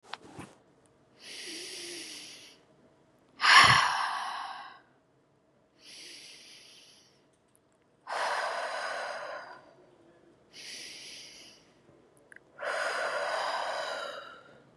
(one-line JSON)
{"exhalation_length": "14.8 s", "exhalation_amplitude": 18119, "exhalation_signal_mean_std_ratio": 0.38, "survey_phase": "beta (2021-08-13 to 2022-03-07)", "age": "18-44", "gender": "Female", "wearing_mask": "No", "symptom_none": true, "smoker_status": "Never smoked", "respiratory_condition_asthma": false, "respiratory_condition_other": false, "recruitment_source": "REACT", "submission_delay": "1 day", "covid_test_result": "Negative", "covid_test_method": "RT-qPCR", "influenza_a_test_result": "Negative", "influenza_b_test_result": "Negative"}